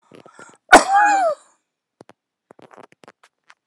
cough_length: 3.7 s
cough_amplitude: 32768
cough_signal_mean_std_ratio: 0.3
survey_phase: alpha (2021-03-01 to 2021-08-12)
age: 65+
gender: Male
wearing_mask: 'No'
symptom_none: true
smoker_status: Ex-smoker
respiratory_condition_asthma: false
respiratory_condition_other: false
recruitment_source: REACT
submission_delay: 2 days
covid_test_result: Negative
covid_test_method: RT-qPCR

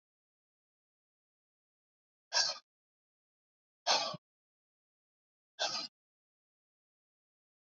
exhalation_length: 7.7 s
exhalation_amplitude: 5420
exhalation_signal_mean_std_ratio: 0.23
survey_phase: alpha (2021-03-01 to 2021-08-12)
age: 45-64
gender: Male
wearing_mask: 'No'
symptom_none: true
smoker_status: Ex-smoker
respiratory_condition_asthma: false
respiratory_condition_other: false
recruitment_source: REACT
submission_delay: 2 days
covid_test_result: Negative
covid_test_method: RT-qPCR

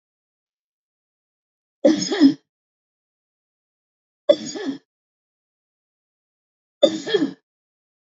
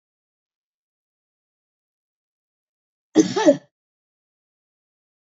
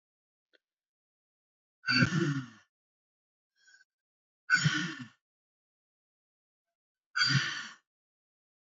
three_cough_length: 8.0 s
three_cough_amplitude: 27473
three_cough_signal_mean_std_ratio: 0.25
cough_length: 5.3 s
cough_amplitude: 27001
cough_signal_mean_std_ratio: 0.18
exhalation_length: 8.6 s
exhalation_amplitude: 8956
exhalation_signal_mean_std_ratio: 0.32
survey_phase: beta (2021-08-13 to 2022-03-07)
age: 65+
gender: Female
wearing_mask: 'No'
symptom_none: true
smoker_status: Current smoker (1 to 10 cigarettes per day)
respiratory_condition_asthma: false
respiratory_condition_other: false
recruitment_source: REACT
submission_delay: 0 days
covid_test_result: Negative
covid_test_method: RT-qPCR
influenza_a_test_result: Negative
influenza_b_test_result: Negative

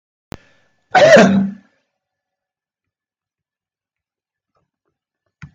cough_length: 5.5 s
cough_amplitude: 32768
cough_signal_mean_std_ratio: 0.27
survey_phase: beta (2021-08-13 to 2022-03-07)
age: 65+
gender: Male
wearing_mask: 'No'
symptom_none: true
smoker_status: Ex-smoker
respiratory_condition_asthma: false
respiratory_condition_other: false
recruitment_source: REACT
submission_delay: 1 day
covid_test_result: Negative
covid_test_method: RT-qPCR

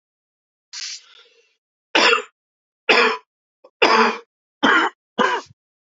three_cough_length: 5.9 s
three_cough_amplitude: 28492
three_cough_signal_mean_std_ratio: 0.4
survey_phase: beta (2021-08-13 to 2022-03-07)
age: 18-44
gender: Male
wearing_mask: 'No'
symptom_cough_any: true
symptom_runny_or_blocked_nose: true
symptom_fatigue: true
symptom_onset: 3 days
smoker_status: Never smoked
respiratory_condition_asthma: false
respiratory_condition_other: false
recruitment_source: Test and Trace
submission_delay: 2 days
covid_test_result: Positive
covid_test_method: RT-qPCR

